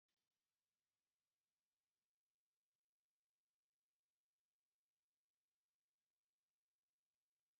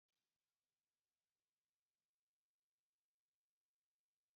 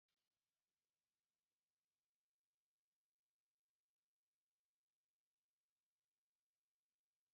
three_cough_length: 7.6 s
three_cough_amplitude: 3
three_cough_signal_mean_std_ratio: 0.2
cough_length: 4.4 s
cough_amplitude: 2
cough_signal_mean_std_ratio: 0.23
exhalation_length: 7.3 s
exhalation_amplitude: 3
exhalation_signal_mean_std_ratio: 0.2
survey_phase: beta (2021-08-13 to 2022-03-07)
age: 65+
gender: Female
wearing_mask: 'No'
symptom_headache: true
smoker_status: Ex-smoker
respiratory_condition_asthma: false
respiratory_condition_other: false
recruitment_source: REACT
submission_delay: 1 day
covid_test_result: Negative
covid_test_method: RT-qPCR
influenza_a_test_result: Negative
influenza_b_test_result: Negative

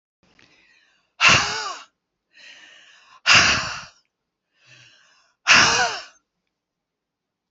exhalation_length: 7.5 s
exhalation_amplitude: 29163
exhalation_signal_mean_std_ratio: 0.33
survey_phase: alpha (2021-03-01 to 2021-08-12)
age: 65+
gender: Female
wearing_mask: 'No'
symptom_none: true
smoker_status: Never smoked
respiratory_condition_asthma: false
respiratory_condition_other: false
recruitment_source: REACT
submission_delay: 2 days
covid_test_result: Negative
covid_test_method: RT-qPCR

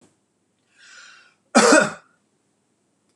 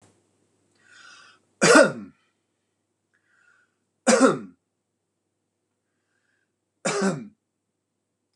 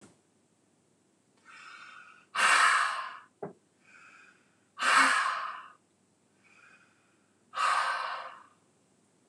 cough_length: 3.2 s
cough_amplitude: 25846
cough_signal_mean_std_ratio: 0.27
three_cough_length: 8.4 s
three_cough_amplitude: 26027
three_cough_signal_mean_std_ratio: 0.25
exhalation_length: 9.3 s
exhalation_amplitude: 10241
exhalation_signal_mean_std_ratio: 0.39
survey_phase: beta (2021-08-13 to 2022-03-07)
age: 45-64
gender: Male
wearing_mask: 'No'
symptom_none: true
smoker_status: Ex-smoker
respiratory_condition_asthma: true
respiratory_condition_other: false
recruitment_source: REACT
submission_delay: 1 day
covid_test_result: Negative
covid_test_method: RT-qPCR
influenza_a_test_result: Negative
influenza_b_test_result: Negative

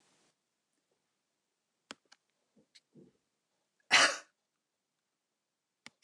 cough_length: 6.0 s
cough_amplitude: 8911
cough_signal_mean_std_ratio: 0.16
survey_phase: beta (2021-08-13 to 2022-03-07)
age: 65+
gender: Female
wearing_mask: 'No'
symptom_none: true
smoker_status: Never smoked
respiratory_condition_asthma: false
respiratory_condition_other: false
recruitment_source: REACT
submission_delay: 2 days
covid_test_result: Negative
covid_test_method: RT-qPCR
influenza_a_test_result: Negative
influenza_b_test_result: Negative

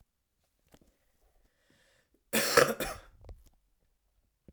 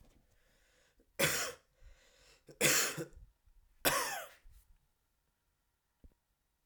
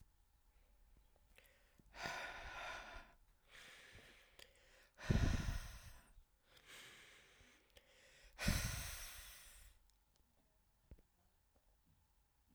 cough_length: 4.5 s
cough_amplitude: 16056
cough_signal_mean_std_ratio: 0.25
three_cough_length: 6.7 s
three_cough_amplitude: 7747
three_cough_signal_mean_std_ratio: 0.33
exhalation_length: 12.5 s
exhalation_amplitude: 2055
exhalation_signal_mean_std_ratio: 0.36
survey_phase: alpha (2021-03-01 to 2021-08-12)
age: 18-44
gender: Male
wearing_mask: 'No'
symptom_cough_any: true
symptom_shortness_of_breath: true
symptom_fatigue: true
symptom_change_to_sense_of_smell_or_taste: true
symptom_loss_of_taste: true
smoker_status: Never smoked
respiratory_condition_asthma: false
respiratory_condition_other: false
recruitment_source: Test and Trace
submission_delay: 2 days
covid_test_result: Positive
covid_test_method: RT-qPCR
covid_ct_value: 13.5
covid_ct_gene: N gene
covid_ct_mean: 13.9
covid_viral_load: 28000000 copies/ml
covid_viral_load_category: High viral load (>1M copies/ml)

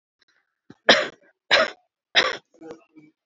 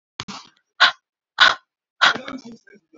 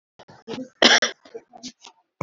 three_cough_length: 3.3 s
three_cough_amplitude: 28315
three_cough_signal_mean_std_ratio: 0.31
exhalation_length: 3.0 s
exhalation_amplitude: 32768
exhalation_signal_mean_std_ratio: 0.3
cough_length: 2.2 s
cough_amplitude: 29345
cough_signal_mean_std_ratio: 0.3
survey_phase: beta (2021-08-13 to 2022-03-07)
age: 18-44
gender: Female
wearing_mask: 'No'
symptom_shortness_of_breath: true
symptom_abdominal_pain: true
symptom_fatigue: true
symptom_onset: 4 days
smoker_status: Never smoked
respiratory_condition_asthma: false
respiratory_condition_other: false
recruitment_source: REACT
submission_delay: 1 day
covid_test_result: Negative
covid_test_method: RT-qPCR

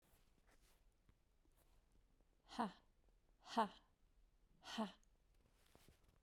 exhalation_length: 6.2 s
exhalation_amplitude: 1470
exhalation_signal_mean_std_ratio: 0.27
survey_phase: beta (2021-08-13 to 2022-03-07)
age: 45-64
gender: Female
wearing_mask: 'No'
symptom_none: true
smoker_status: Current smoker (e-cigarettes or vapes only)
respiratory_condition_asthma: false
respiratory_condition_other: false
recruitment_source: REACT
submission_delay: 3 days
covid_test_result: Negative
covid_test_method: RT-qPCR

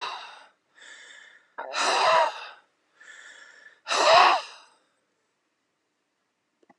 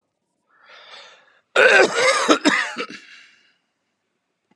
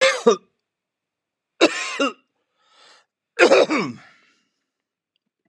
exhalation_length: 6.8 s
exhalation_amplitude: 23761
exhalation_signal_mean_std_ratio: 0.36
cough_length: 4.6 s
cough_amplitude: 32671
cough_signal_mean_std_ratio: 0.39
three_cough_length: 5.5 s
three_cough_amplitude: 31865
three_cough_signal_mean_std_ratio: 0.33
survey_phase: beta (2021-08-13 to 2022-03-07)
age: 65+
gender: Male
wearing_mask: 'No'
symptom_none: true
smoker_status: Current smoker (11 or more cigarettes per day)
respiratory_condition_asthma: false
respiratory_condition_other: false
recruitment_source: REACT
submission_delay: 2 days
covid_test_result: Negative
covid_test_method: RT-qPCR
influenza_a_test_result: Negative
influenza_b_test_result: Negative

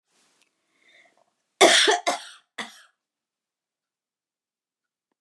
cough_length: 5.2 s
cough_amplitude: 28203
cough_signal_mean_std_ratio: 0.24
survey_phase: alpha (2021-03-01 to 2021-08-12)
age: 65+
gender: Female
wearing_mask: 'No'
symptom_none: true
smoker_status: Never smoked
respiratory_condition_asthma: true
respiratory_condition_other: false
recruitment_source: REACT
submission_delay: 2 days
covid_test_result: Negative
covid_test_method: RT-qPCR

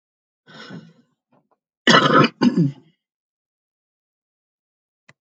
cough_length: 5.2 s
cough_amplitude: 29287
cough_signal_mean_std_ratio: 0.29
survey_phase: alpha (2021-03-01 to 2021-08-12)
age: 65+
gender: Female
wearing_mask: 'No'
symptom_none: true
smoker_status: Ex-smoker
respiratory_condition_asthma: false
respiratory_condition_other: false
recruitment_source: REACT
submission_delay: 2 days
covid_test_result: Negative
covid_test_method: RT-qPCR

